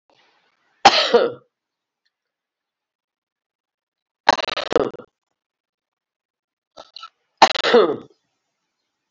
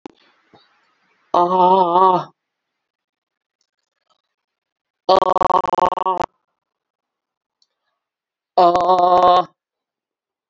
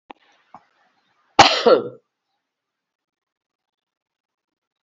{"three_cough_length": "9.1 s", "three_cough_amplitude": 32767, "three_cough_signal_mean_std_ratio": 0.25, "exhalation_length": "10.5 s", "exhalation_amplitude": 30348, "exhalation_signal_mean_std_ratio": 0.38, "cough_length": "4.8 s", "cough_amplitude": 32768, "cough_signal_mean_std_ratio": 0.21, "survey_phase": "alpha (2021-03-01 to 2021-08-12)", "age": "65+", "gender": "Female", "wearing_mask": "No", "symptom_cough_any": true, "symptom_change_to_sense_of_smell_or_taste": true, "symptom_loss_of_taste": true, "smoker_status": "Ex-smoker", "respiratory_condition_asthma": false, "respiratory_condition_other": false, "recruitment_source": "Test and Trace", "submission_delay": "2 days", "covid_test_result": "Positive", "covid_test_method": "LFT"}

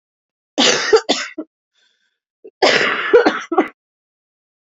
{"cough_length": "4.8 s", "cough_amplitude": 32767, "cough_signal_mean_std_ratio": 0.42, "survey_phase": "beta (2021-08-13 to 2022-03-07)", "age": "18-44", "gender": "Female", "wearing_mask": "No", "symptom_cough_any": true, "symptom_new_continuous_cough": true, "symptom_runny_or_blocked_nose": true, "symptom_shortness_of_breath": true, "symptom_sore_throat": true, "symptom_fatigue": true, "symptom_headache": true, "symptom_change_to_sense_of_smell_or_taste": true, "smoker_status": "Current smoker (11 or more cigarettes per day)", "respiratory_condition_asthma": false, "respiratory_condition_other": false, "recruitment_source": "Test and Trace", "submission_delay": "1 day", "covid_test_result": "Positive", "covid_test_method": "RT-qPCR", "covid_ct_value": 23.0, "covid_ct_gene": "N gene"}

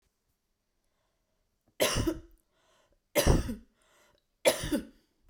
{"three_cough_length": "5.3 s", "three_cough_amplitude": 11327, "three_cough_signal_mean_std_ratio": 0.33, "survey_phase": "beta (2021-08-13 to 2022-03-07)", "age": "45-64", "gender": "Female", "wearing_mask": "No", "symptom_none": true, "smoker_status": "Ex-smoker", "respiratory_condition_asthma": true, "respiratory_condition_other": false, "recruitment_source": "REACT", "submission_delay": "1 day", "covid_test_result": "Negative", "covid_test_method": "RT-qPCR"}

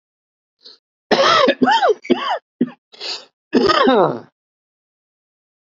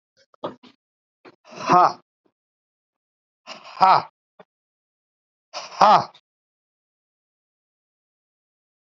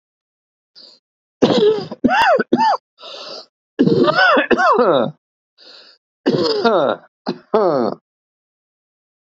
{"cough_length": "5.6 s", "cough_amplitude": 28956, "cough_signal_mean_std_ratio": 0.46, "exhalation_length": "9.0 s", "exhalation_amplitude": 32768, "exhalation_signal_mean_std_ratio": 0.22, "three_cough_length": "9.4 s", "three_cough_amplitude": 29473, "three_cough_signal_mean_std_ratio": 0.53, "survey_phase": "beta (2021-08-13 to 2022-03-07)", "age": "65+", "gender": "Male", "wearing_mask": "No", "symptom_cough_any": true, "symptom_runny_or_blocked_nose": true, "symptom_shortness_of_breath": true, "symptom_headache": true, "symptom_onset": "4 days", "smoker_status": "Never smoked", "respiratory_condition_asthma": true, "respiratory_condition_other": false, "recruitment_source": "Test and Trace", "submission_delay": "1 day", "covid_test_result": "Positive", "covid_test_method": "RT-qPCR", "covid_ct_value": 19.7, "covid_ct_gene": "ORF1ab gene", "covid_ct_mean": 20.3, "covid_viral_load": "210000 copies/ml", "covid_viral_load_category": "Low viral load (10K-1M copies/ml)"}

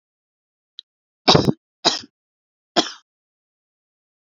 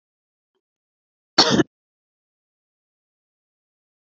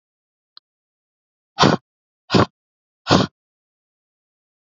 {"three_cough_length": "4.3 s", "three_cough_amplitude": 29293, "three_cough_signal_mean_std_ratio": 0.23, "cough_length": "4.1 s", "cough_amplitude": 30819, "cough_signal_mean_std_ratio": 0.18, "exhalation_length": "4.8 s", "exhalation_amplitude": 32768, "exhalation_signal_mean_std_ratio": 0.24, "survey_phase": "beta (2021-08-13 to 2022-03-07)", "age": "18-44", "gender": "Female", "wearing_mask": "No", "symptom_none": true, "smoker_status": "Never smoked", "respiratory_condition_asthma": false, "respiratory_condition_other": false, "recruitment_source": "REACT", "submission_delay": "0 days", "covid_test_result": "Negative", "covid_test_method": "RT-qPCR", "influenza_a_test_result": "Unknown/Void", "influenza_b_test_result": "Unknown/Void"}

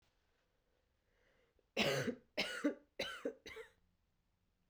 {"three_cough_length": "4.7 s", "three_cough_amplitude": 2345, "three_cough_signal_mean_std_ratio": 0.37, "survey_phase": "beta (2021-08-13 to 2022-03-07)", "age": "18-44", "gender": "Female", "wearing_mask": "No", "symptom_cough_any": true, "symptom_runny_or_blocked_nose": true, "symptom_sore_throat": true, "symptom_headache": true, "symptom_onset": "3 days", "smoker_status": "Never smoked", "respiratory_condition_asthma": false, "respiratory_condition_other": false, "recruitment_source": "Test and Trace", "submission_delay": "2 days", "covid_test_result": "Positive", "covid_test_method": "RT-qPCR", "covid_ct_value": 19.1, "covid_ct_gene": "ORF1ab gene", "covid_ct_mean": 19.3, "covid_viral_load": "460000 copies/ml", "covid_viral_load_category": "Low viral load (10K-1M copies/ml)"}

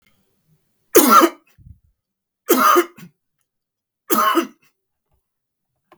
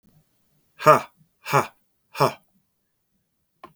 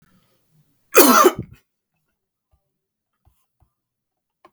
{"three_cough_length": "6.0 s", "three_cough_amplitude": 32768, "three_cough_signal_mean_std_ratio": 0.33, "exhalation_length": "3.8 s", "exhalation_amplitude": 32766, "exhalation_signal_mean_std_ratio": 0.24, "cough_length": "4.5 s", "cough_amplitude": 32768, "cough_signal_mean_std_ratio": 0.23, "survey_phase": "beta (2021-08-13 to 2022-03-07)", "age": "65+", "gender": "Male", "wearing_mask": "No", "symptom_none": true, "smoker_status": "Never smoked", "respiratory_condition_asthma": false, "respiratory_condition_other": false, "recruitment_source": "REACT", "submission_delay": "3 days", "covid_test_result": "Negative", "covid_test_method": "RT-qPCR", "influenza_a_test_result": "Negative", "influenza_b_test_result": "Negative"}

